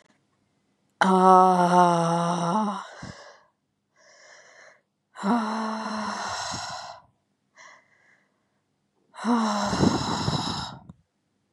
exhalation_length: 11.5 s
exhalation_amplitude: 22720
exhalation_signal_mean_std_ratio: 0.47
survey_phase: beta (2021-08-13 to 2022-03-07)
age: 45-64
gender: Female
wearing_mask: 'No'
symptom_cough_any: true
symptom_sore_throat: true
symptom_fatigue: true
symptom_headache: true
symptom_change_to_sense_of_smell_or_taste: true
symptom_onset: 3 days
smoker_status: Ex-smoker
respiratory_condition_asthma: false
respiratory_condition_other: false
recruitment_source: Test and Trace
submission_delay: 1 day
covid_test_result: Positive
covid_test_method: RT-qPCR
covid_ct_value: 15.8
covid_ct_gene: ORF1ab gene
covid_ct_mean: 16.1
covid_viral_load: 5300000 copies/ml
covid_viral_load_category: High viral load (>1M copies/ml)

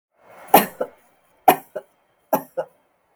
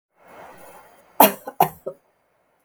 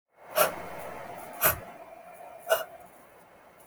three_cough_length: 3.2 s
three_cough_amplitude: 32768
three_cough_signal_mean_std_ratio: 0.25
cough_length: 2.6 s
cough_amplitude: 32768
cough_signal_mean_std_ratio: 0.23
exhalation_length: 3.7 s
exhalation_amplitude: 13340
exhalation_signal_mean_std_ratio: 0.42
survey_phase: beta (2021-08-13 to 2022-03-07)
age: 18-44
gender: Female
wearing_mask: 'No'
symptom_none: true
smoker_status: Never smoked
respiratory_condition_asthma: false
respiratory_condition_other: false
recruitment_source: REACT
submission_delay: 1 day
covid_test_result: Negative
covid_test_method: RT-qPCR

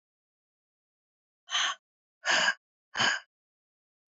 exhalation_length: 4.1 s
exhalation_amplitude: 6819
exhalation_signal_mean_std_ratio: 0.34
survey_phase: alpha (2021-03-01 to 2021-08-12)
age: 45-64
gender: Female
wearing_mask: 'No'
symptom_none: true
smoker_status: Ex-smoker
respiratory_condition_asthma: false
respiratory_condition_other: false
recruitment_source: REACT
submission_delay: 2 days
covid_test_result: Negative
covid_test_method: RT-qPCR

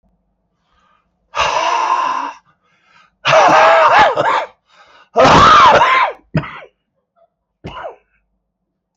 exhalation_length: 9.0 s
exhalation_amplitude: 31035
exhalation_signal_mean_std_ratio: 0.52
survey_phase: beta (2021-08-13 to 2022-03-07)
age: 65+
gender: Male
wearing_mask: 'Yes'
symptom_cough_any: true
symptom_new_continuous_cough: true
symptom_runny_or_blocked_nose: true
symptom_sore_throat: true
symptom_fatigue: true
symptom_onset: 4 days
smoker_status: Ex-smoker
respiratory_condition_asthma: false
respiratory_condition_other: false
recruitment_source: Test and Trace
submission_delay: 2 days
covid_test_result: Positive
covid_test_method: RT-qPCR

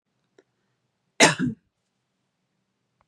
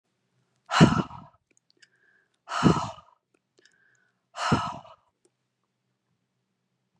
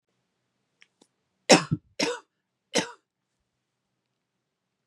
cough_length: 3.1 s
cough_amplitude: 29749
cough_signal_mean_std_ratio: 0.21
exhalation_length: 7.0 s
exhalation_amplitude: 20515
exhalation_signal_mean_std_ratio: 0.26
three_cough_length: 4.9 s
three_cough_amplitude: 30707
three_cough_signal_mean_std_ratio: 0.19
survey_phase: beta (2021-08-13 to 2022-03-07)
age: 45-64
gender: Female
wearing_mask: 'No'
symptom_fatigue: true
symptom_onset: 9 days
smoker_status: Never smoked
respiratory_condition_asthma: false
respiratory_condition_other: false
recruitment_source: REACT
submission_delay: 1 day
covid_test_result: Negative
covid_test_method: RT-qPCR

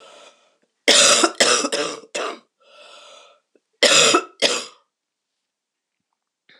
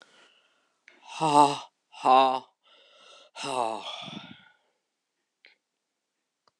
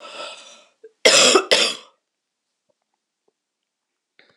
three_cough_length: 6.6 s
three_cough_amplitude: 26028
three_cough_signal_mean_std_ratio: 0.39
exhalation_length: 6.6 s
exhalation_amplitude: 19427
exhalation_signal_mean_std_ratio: 0.3
cough_length: 4.4 s
cough_amplitude: 26028
cough_signal_mean_std_ratio: 0.31
survey_phase: beta (2021-08-13 to 2022-03-07)
age: 65+
gender: Female
wearing_mask: 'No'
symptom_cough_any: true
symptom_runny_or_blocked_nose: true
symptom_fatigue: true
symptom_onset: 5 days
smoker_status: Never smoked
respiratory_condition_asthma: false
respiratory_condition_other: false
recruitment_source: Test and Trace
submission_delay: 2 days
covid_test_result: Positive
covid_test_method: RT-qPCR
covid_ct_value: 25.2
covid_ct_gene: N gene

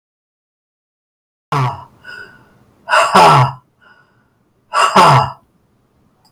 exhalation_length: 6.3 s
exhalation_amplitude: 32768
exhalation_signal_mean_std_ratio: 0.39
survey_phase: beta (2021-08-13 to 2022-03-07)
age: 65+
gender: Male
wearing_mask: 'No'
symptom_none: true
smoker_status: Ex-smoker
respiratory_condition_asthma: false
respiratory_condition_other: false
recruitment_source: REACT
submission_delay: 3 days
covid_test_result: Negative
covid_test_method: RT-qPCR
influenza_a_test_result: Negative
influenza_b_test_result: Negative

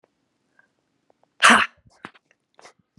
exhalation_length: 3.0 s
exhalation_amplitude: 32547
exhalation_signal_mean_std_ratio: 0.22
survey_phase: beta (2021-08-13 to 2022-03-07)
age: 45-64
gender: Female
wearing_mask: 'No'
symptom_cough_any: true
symptom_shortness_of_breath: true
symptom_sore_throat: true
symptom_fatigue: true
symptom_headache: true
symptom_onset: 2 days
smoker_status: Ex-smoker
respiratory_condition_asthma: true
respiratory_condition_other: false
recruitment_source: Test and Trace
submission_delay: 1 day
covid_test_result: Positive
covid_test_method: RT-qPCR
covid_ct_value: 20.0
covid_ct_gene: ORF1ab gene
covid_ct_mean: 20.4
covid_viral_load: 200000 copies/ml
covid_viral_load_category: Low viral load (10K-1M copies/ml)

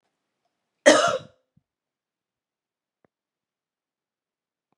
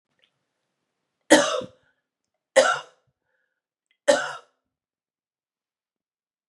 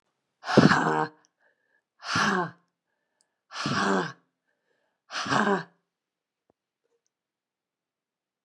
cough_length: 4.8 s
cough_amplitude: 26945
cough_signal_mean_std_ratio: 0.18
three_cough_length: 6.5 s
three_cough_amplitude: 29922
three_cough_signal_mean_std_ratio: 0.23
exhalation_length: 8.4 s
exhalation_amplitude: 21309
exhalation_signal_mean_std_ratio: 0.35
survey_phase: beta (2021-08-13 to 2022-03-07)
age: 45-64
gender: Female
wearing_mask: 'No'
symptom_cough_any: true
symptom_runny_or_blocked_nose: true
symptom_headache: true
symptom_change_to_sense_of_smell_or_taste: true
symptom_loss_of_taste: true
symptom_onset: 3 days
smoker_status: Never smoked
respiratory_condition_asthma: false
respiratory_condition_other: false
recruitment_source: Test and Trace
submission_delay: 1 day
covid_test_result: Positive
covid_test_method: ePCR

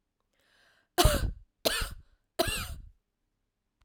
three_cough_length: 3.8 s
three_cough_amplitude: 11815
three_cough_signal_mean_std_ratio: 0.35
survey_phase: alpha (2021-03-01 to 2021-08-12)
age: 18-44
gender: Female
wearing_mask: 'No'
symptom_none: true
smoker_status: Ex-smoker
respiratory_condition_asthma: true
respiratory_condition_other: false
recruitment_source: REACT
submission_delay: 5 days
covid_test_result: Negative
covid_test_method: RT-qPCR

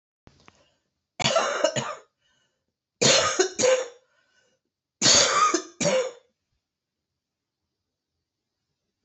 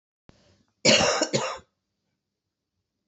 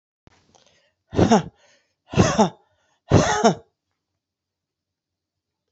three_cough_length: 9.0 s
three_cough_amplitude: 19507
three_cough_signal_mean_std_ratio: 0.4
cough_length: 3.1 s
cough_amplitude: 17815
cough_signal_mean_std_ratio: 0.34
exhalation_length: 5.7 s
exhalation_amplitude: 26593
exhalation_signal_mean_std_ratio: 0.32
survey_phase: beta (2021-08-13 to 2022-03-07)
age: 45-64
gender: Female
wearing_mask: 'No'
symptom_cough_any: true
symptom_new_continuous_cough: true
symptom_runny_or_blocked_nose: true
symptom_fatigue: true
symptom_headache: true
symptom_onset: 5 days
smoker_status: Ex-smoker
respiratory_condition_asthma: false
respiratory_condition_other: false
recruitment_source: Test and Trace
submission_delay: 2 days
covid_test_result: Positive
covid_test_method: RT-qPCR
covid_ct_value: 14.1
covid_ct_gene: N gene
covid_ct_mean: 15.0
covid_viral_load: 12000000 copies/ml
covid_viral_load_category: High viral load (>1M copies/ml)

